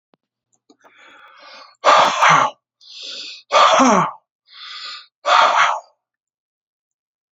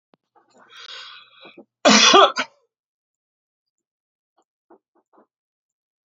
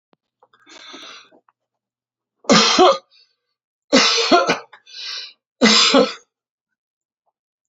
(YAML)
exhalation_length: 7.3 s
exhalation_amplitude: 31630
exhalation_signal_mean_std_ratio: 0.43
cough_length: 6.1 s
cough_amplitude: 30007
cough_signal_mean_std_ratio: 0.24
three_cough_length: 7.7 s
three_cough_amplitude: 31469
three_cough_signal_mean_std_ratio: 0.38
survey_phase: beta (2021-08-13 to 2022-03-07)
age: 65+
gender: Male
wearing_mask: 'No'
symptom_none: true
smoker_status: Never smoked
respiratory_condition_asthma: false
respiratory_condition_other: false
recruitment_source: REACT
submission_delay: 3 days
covid_test_result: Negative
covid_test_method: RT-qPCR